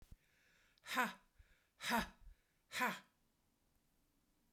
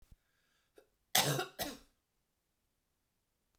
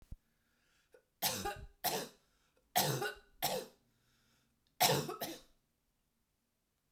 {
  "exhalation_length": "4.5 s",
  "exhalation_amplitude": 2745,
  "exhalation_signal_mean_std_ratio": 0.33,
  "cough_length": "3.6 s",
  "cough_amplitude": 13573,
  "cough_signal_mean_std_ratio": 0.26,
  "three_cough_length": "6.9 s",
  "three_cough_amplitude": 5151,
  "three_cough_signal_mean_std_ratio": 0.37,
  "survey_phase": "beta (2021-08-13 to 2022-03-07)",
  "age": "45-64",
  "gender": "Female",
  "wearing_mask": "No",
  "symptom_none": true,
  "smoker_status": "Ex-smoker",
  "respiratory_condition_asthma": false,
  "respiratory_condition_other": true,
  "recruitment_source": "REACT",
  "submission_delay": "1 day",
  "covid_test_result": "Negative",
  "covid_test_method": "RT-qPCR"
}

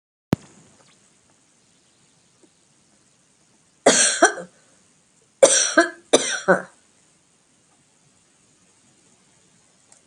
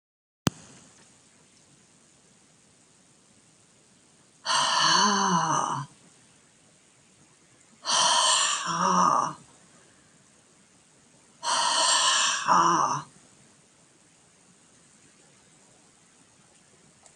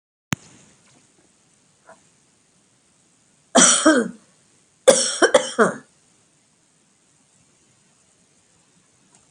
{
  "three_cough_length": "10.1 s",
  "three_cough_amplitude": 32767,
  "three_cough_signal_mean_std_ratio": 0.26,
  "exhalation_length": "17.2 s",
  "exhalation_amplitude": 27388,
  "exhalation_signal_mean_std_ratio": 0.44,
  "cough_length": "9.3 s",
  "cough_amplitude": 32767,
  "cough_signal_mean_std_ratio": 0.26,
  "survey_phase": "alpha (2021-03-01 to 2021-08-12)",
  "age": "65+",
  "gender": "Female",
  "wearing_mask": "No",
  "symptom_none": true,
  "smoker_status": "Never smoked",
  "respiratory_condition_asthma": false,
  "respiratory_condition_other": false,
  "recruitment_source": "REACT",
  "submission_delay": "1 day",
  "covid_test_result": "Negative",
  "covid_test_method": "RT-qPCR"
}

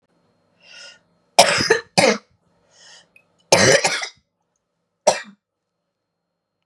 {
  "three_cough_length": "6.7 s",
  "three_cough_amplitude": 32768,
  "three_cough_signal_mean_std_ratio": 0.31,
  "survey_phase": "beta (2021-08-13 to 2022-03-07)",
  "age": "18-44",
  "gender": "Female",
  "wearing_mask": "No",
  "symptom_cough_any": true,
  "symptom_new_continuous_cough": true,
  "symptom_runny_or_blocked_nose": true,
  "symptom_shortness_of_breath": true,
  "symptom_sore_throat": true,
  "symptom_fatigue": true,
  "symptom_headache": true,
  "symptom_onset": "3 days",
  "smoker_status": "Never smoked",
  "respiratory_condition_asthma": true,
  "respiratory_condition_other": false,
  "recruitment_source": "Test and Trace",
  "submission_delay": "1 day",
  "covid_test_result": "Negative",
  "covid_test_method": "RT-qPCR"
}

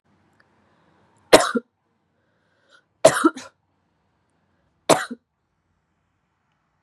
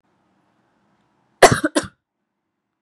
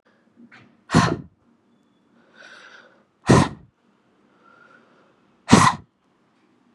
{
  "three_cough_length": "6.8 s",
  "three_cough_amplitude": 32768,
  "three_cough_signal_mean_std_ratio": 0.19,
  "cough_length": "2.8 s",
  "cough_amplitude": 32768,
  "cough_signal_mean_std_ratio": 0.2,
  "exhalation_length": "6.7 s",
  "exhalation_amplitude": 32768,
  "exhalation_signal_mean_std_ratio": 0.25,
  "survey_phase": "beta (2021-08-13 to 2022-03-07)",
  "age": "18-44",
  "gender": "Female",
  "wearing_mask": "No",
  "symptom_runny_or_blocked_nose": true,
  "symptom_sore_throat": true,
  "symptom_fatigue": true,
  "symptom_change_to_sense_of_smell_or_taste": true,
  "symptom_onset": "4 days",
  "smoker_status": "Never smoked",
  "respiratory_condition_asthma": false,
  "respiratory_condition_other": false,
  "recruitment_source": "Test and Trace",
  "submission_delay": "2 days",
  "covid_test_result": "Positive",
  "covid_test_method": "RT-qPCR",
  "covid_ct_value": 30.7,
  "covid_ct_gene": "N gene"
}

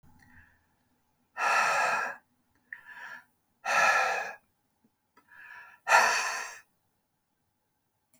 {
  "exhalation_length": "8.2 s",
  "exhalation_amplitude": 14766,
  "exhalation_signal_mean_std_ratio": 0.41,
  "survey_phase": "beta (2021-08-13 to 2022-03-07)",
  "age": "65+",
  "gender": "Male",
  "wearing_mask": "No",
  "symptom_none": true,
  "smoker_status": "Never smoked",
  "respiratory_condition_asthma": false,
  "respiratory_condition_other": false,
  "recruitment_source": "REACT",
  "submission_delay": "2 days",
  "covid_test_result": "Negative",
  "covid_test_method": "RT-qPCR"
}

